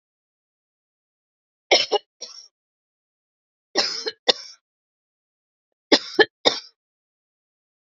{"three_cough_length": "7.9 s", "three_cough_amplitude": 32767, "three_cough_signal_mean_std_ratio": 0.22, "survey_phase": "beta (2021-08-13 to 2022-03-07)", "age": "45-64", "gender": "Female", "wearing_mask": "No", "symptom_cough_any": true, "symptom_onset": "3 days", "smoker_status": "Never smoked", "respiratory_condition_asthma": true, "respiratory_condition_other": false, "recruitment_source": "Test and Trace", "submission_delay": "2 days", "covid_test_result": "Negative", "covid_test_method": "RT-qPCR"}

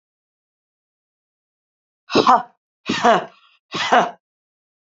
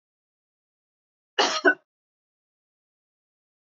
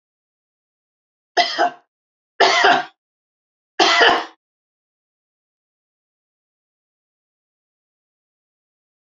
{"exhalation_length": "4.9 s", "exhalation_amplitude": 30078, "exhalation_signal_mean_std_ratio": 0.32, "cough_length": "3.8 s", "cough_amplitude": 17673, "cough_signal_mean_std_ratio": 0.2, "three_cough_length": "9.0 s", "three_cough_amplitude": 28511, "three_cough_signal_mean_std_ratio": 0.28, "survey_phase": "beta (2021-08-13 to 2022-03-07)", "age": "65+", "gender": "Female", "wearing_mask": "No", "symptom_none": true, "smoker_status": "Ex-smoker", "respiratory_condition_asthma": false, "respiratory_condition_other": false, "recruitment_source": "REACT", "submission_delay": "2 days", "covid_test_result": "Negative", "covid_test_method": "RT-qPCR", "influenza_a_test_result": "Negative", "influenza_b_test_result": "Negative"}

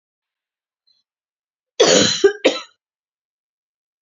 {"cough_length": "4.0 s", "cough_amplitude": 29918, "cough_signal_mean_std_ratio": 0.3, "survey_phase": "beta (2021-08-13 to 2022-03-07)", "age": "45-64", "gender": "Female", "wearing_mask": "No", "symptom_cough_any": true, "symptom_runny_or_blocked_nose": true, "symptom_fatigue": true, "symptom_headache": true, "symptom_change_to_sense_of_smell_or_taste": true, "symptom_other": true, "symptom_onset": "12 days", "smoker_status": "Never smoked", "respiratory_condition_asthma": false, "respiratory_condition_other": false, "recruitment_source": "REACT", "submission_delay": "0 days", "covid_test_result": "Positive", "covid_test_method": "RT-qPCR", "covid_ct_value": 26.0, "covid_ct_gene": "E gene", "influenza_a_test_result": "Negative", "influenza_b_test_result": "Negative"}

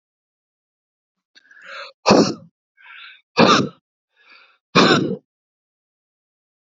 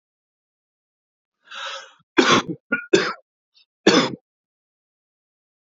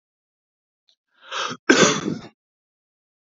{"exhalation_length": "6.7 s", "exhalation_amplitude": 31268, "exhalation_signal_mean_std_ratio": 0.31, "three_cough_length": "5.7 s", "three_cough_amplitude": 28500, "three_cough_signal_mean_std_ratio": 0.29, "cough_length": "3.2 s", "cough_amplitude": 27631, "cough_signal_mean_std_ratio": 0.3, "survey_phase": "beta (2021-08-13 to 2022-03-07)", "age": "18-44", "gender": "Male", "wearing_mask": "No", "symptom_none": true, "symptom_onset": "11 days", "smoker_status": "Ex-smoker", "respiratory_condition_asthma": false, "respiratory_condition_other": false, "recruitment_source": "REACT", "submission_delay": "3 days", "covid_test_result": "Negative", "covid_test_method": "RT-qPCR", "influenza_a_test_result": "Negative", "influenza_b_test_result": "Negative"}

